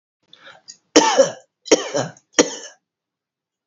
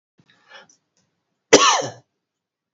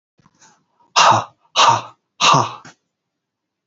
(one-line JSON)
{"three_cough_length": "3.7 s", "three_cough_amplitude": 32768, "three_cough_signal_mean_std_ratio": 0.32, "cough_length": "2.7 s", "cough_amplitude": 31842, "cough_signal_mean_std_ratio": 0.26, "exhalation_length": "3.7 s", "exhalation_amplitude": 32768, "exhalation_signal_mean_std_ratio": 0.38, "survey_phase": "beta (2021-08-13 to 2022-03-07)", "age": "45-64", "gender": "Male", "wearing_mask": "No", "symptom_cough_any": true, "symptom_runny_or_blocked_nose": true, "symptom_diarrhoea": true, "symptom_fatigue": true, "symptom_fever_high_temperature": true, "symptom_headache": true, "symptom_change_to_sense_of_smell_or_taste": true, "symptom_loss_of_taste": true, "symptom_other": true, "smoker_status": "Never smoked", "respiratory_condition_asthma": false, "respiratory_condition_other": false, "recruitment_source": "Test and Trace", "submission_delay": "2 days", "covid_test_result": "Positive", "covid_test_method": "RT-qPCR", "covid_ct_value": 18.9, "covid_ct_gene": "ORF1ab gene", "covid_ct_mean": 19.1, "covid_viral_load": "560000 copies/ml", "covid_viral_load_category": "Low viral load (10K-1M copies/ml)"}